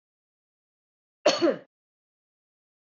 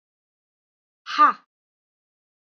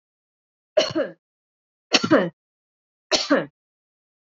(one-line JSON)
{"cough_length": "2.8 s", "cough_amplitude": 12073, "cough_signal_mean_std_ratio": 0.24, "exhalation_length": "2.5 s", "exhalation_amplitude": 18111, "exhalation_signal_mean_std_ratio": 0.22, "three_cough_length": "4.3 s", "three_cough_amplitude": 32016, "three_cough_signal_mean_std_ratio": 0.32, "survey_phase": "beta (2021-08-13 to 2022-03-07)", "age": "45-64", "gender": "Female", "wearing_mask": "No", "symptom_none": true, "smoker_status": "Ex-smoker", "respiratory_condition_asthma": false, "respiratory_condition_other": false, "recruitment_source": "REACT", "submission_delay": "1 day", "covid_test_result": "Negative", "covid_test_method": "RT-qPCR", "influenza_a_test_result": "Negative", "influenza_b_test_result": "Negative"}